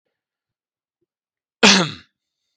{"cough_length": "2.6 s", "cough_amplitude": 32768, "cough_signal_mean_std_ratio": 0.24, "survey_phase": "beta (2021-08-13 to 2022-03-07)", "age": "45-64", "gender": "Male", "wearing_mask": "No", "symptom_none": true, "smoker_status": "Never smoked", "respiratory_condition_asthma": false, "respiratory_condition_other": false, "recruitment_source": "REACT", "submission_delay": "3 days", "covid_test_result": "Negative", "covid_test_method": "RT-qPCR", "influenza_a_test_result": "Negative", "influenza_b_test_result": "Negative"}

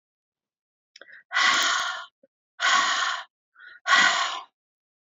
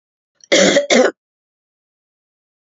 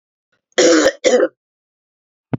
{"exhalation_length": "5.1 s", "exhalation_amplitude": 18835, "exhalation_signal_mean_std_ratio": 0.49, "cough_length": "2.7 s", "cough_amplitude": 30464, "cough_signal_mean_std_ratio": 0.37, "three_cough_length": "2.4 s", "three_cough_amplitude": 32768, "three_cough_signal_mean_std_ratio": 0.42, "survey_phase": "beta (2021-08-13 to 2022-03-07)", "age": "65+", "gender": "Female", "wearing_mask": "No", "symptom_none": true, "symptom_onset": "5 days", "smoker_status": "Never smoked", "respiratory_condition_asthma": false, "respiratory_condition_other": false, "recruitment_source": "REACT", "submission_delay": "2 days", "covid_test_result": "Negative", "covid_test_method": "RT-qPCR", "influenza_a_test_result": "Negative", "influenza_b_test_result": "Negative"}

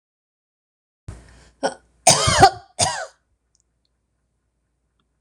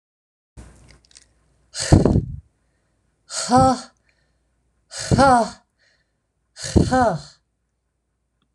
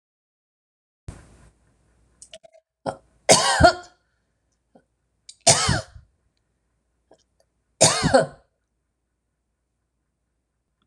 {"cough_length": "5.2 s", "cough_amplitude": 26028, "cough_signal_mean_std_ratio": 0.27, "exhalation_length": "8.5 s", "exhalation_amplitude": 26028, "exhalation_signal_mean_std_ratio": 0.35, "three_cough_length": "10.9 s", "three_cough_amplitude": 26028, "three_cough_signal_mean_std_ratio": 0.25, "survey_phase": "beta (2021-08-13 to 2022-03-07)", "age": "65+", "gender": "Female", "wearing_mask": "No", "symptom_none": true, "smoker_status": "Ex-smoker", "respiratory_condition_asthma": false, "respiratory_condition_other": false, "recruitment_source": "REACT", "submission_delay": "1 day", "covid_test_result": "Negative", "covid_test_method": "RT-qPCR"}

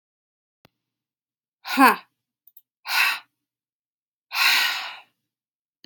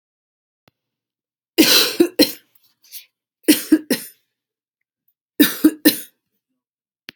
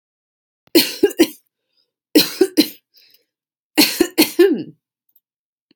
{"exhalation_length": "5.9 s", "exhalation_amplitude": 28782, "exhalation_signal_mean_std_ratio": 0.31, "three_cough_length": "7.2 s", "three_cough_amplitude": 32768, "three_cough_signal_mean_std_ratio": 0.3, "cough_length": "5.8 s", "cough_amplitude": 32767, "cough_signal_mean_std_ratio": 0.35, "survey_phase": "alpha (2021-03-01 to 2021-08-12)", "age": "18-44", "gender": "Female", "wearing_mask": "No", "symptom_none": true, "smoker_status": "Ex-smoker", "respiratory_condition_asthma": false, "respiratory_condition_other": false, "recruitment_source": "REACT", "submission_delay": "2 days", "covid_test_result": "Negative", "covid_test_method": "RT-qPCR"}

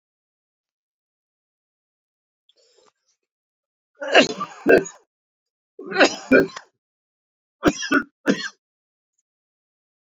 {"three_cough_length": "10.2 s", "three_cough_amplitude": 28180, "three_cough_signal_mean_std_ratio": 0.26, "survey_phase": "beta (2021-08-13 to 2022-03-07)", "age": "45-64", "gender": "Male", "wearing_mask": "No", "symptom_cough_any": true, "symptom_fatigue": true, "symptom_headache": true, "symptom_change_to_sense_of_smell_or_taste": true, "symptom_loss_of_taste": true, "smoker_status": "Never smoked", "respiratory_condition_asthma": false, "respiratory_condition_other": false, "recruitment_source": "Test and Trace", "submission_delay": "2 days", "covid_test_result": "Positive", "covid_test_method": "RT-qPCR", "covid_ct_value": 24.8, "covid_ct_gene": "ORF1ab gene", "covid_ct_mean": 25.5, "covid_viral_load": "4300 copies/ml", "covid_viral_load_category": "Minimal viral load (< 10K copies/ml)"}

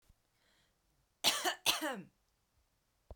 {"cough_length": "3.2 s", "cough_amplitude": 6505, "cough_signal_mean_std_ratio": 0.33, "survey_phase": "beta (2021-08-13 to 2022-03-07)", "age": "45-64", "gender": "Female", "wearing_mask": "No", "symptom_none": true, "smoker_status": "Ex-smoker", "respiratory_condition_asthma": false, "respiratory_condition_other": false, "recruitment_source": "REACT", "submission_delay": "2 days", "covid_test_result": "Negative", "covid_test_method": "RT-qPCR"}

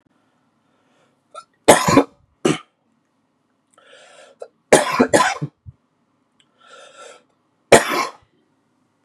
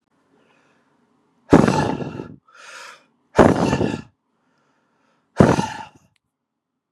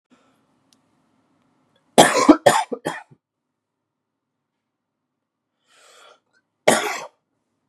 {"three_cough_length": "9.0 s", "three_cough_amplitude": 32768, "three_cough_signal_mean_std_ratio": 0.27, "exhalation_length": "6.9 s", "exhalation_amplitude": 32768, "exhalation_signal_mean_std_ratio": 0.32, "cough_length": "7.7 s", "cough_amplitude": 32768, "cough_signal_mean_std_ratio": 0.23, "survey_phase": "beta (2021-08-13 to 2022-03-07)", "age": "18-44", "gender": "Male", "wearing_mask": "No", "symptom_cough_any": true, "symptom_new_continuous_cough": true, "symptom_sore_throat": true, "symptom_fatigue": true, "symptom_fever_high_temperature": true, "symptom_headache": true, "symptom_change_to_sense_of_smell_or_taste": true, "symptom_loss_of_taste": true, "symptom_onset": "4 days", "smoker_status": "Ex-smoker", "respiratory_condition_asthma": false, "respiratory_condition_other": false, "recruitment_source": "Test and Trace", "submission_delay": "2 days", "covid_test_result": "Positive", "covid_test_method": "RT-qPCR", "covid_ct_value": 14.7, "covid_ct_gene": "ORF1ab gene"}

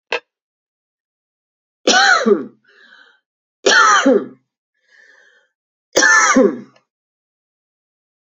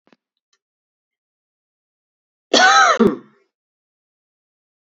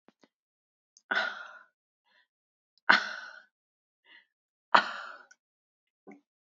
{"three_cough_length": "8.4 s", "three_cough_amplitude": 32767, "three_cough_signal_mean_std_ratio": 0.38, "cough_length": "4.9 s", "cough_amplitude": 32768, "cough_signal_mean_std_ratio": 0.28, "exhalation_length": "6.6 s", "exhalation_amplitude": 26282, "exhalation_signal_mean_std_ratio": 0.21, "survey_phase": "beta (2021-08-13 to 2022-03-07)", "age": "45-64", "gender": "Female", "wearing_mask": "No", "symptom_runny_or_blocked_nose": true, "symptom_headache": true, "smoker_status": "Never smoked", "respiratory_condition_asthma": false, "respiratory_condition_other": false, "recruitment_source": "Test and Trace", "submission_delay": "2 days", "covid_test_result": "Positive", "covid_test_method": "RT-qPCR", "covid_ct_value": 18.8, "covid_ct_gene": "ORF1ab gene", "covid_ct_mean": 21.6, "covid_viral_load": "81000 copies/ml", "covid_viral_load_category": "Low viral load (10K-1M copies/ml)"}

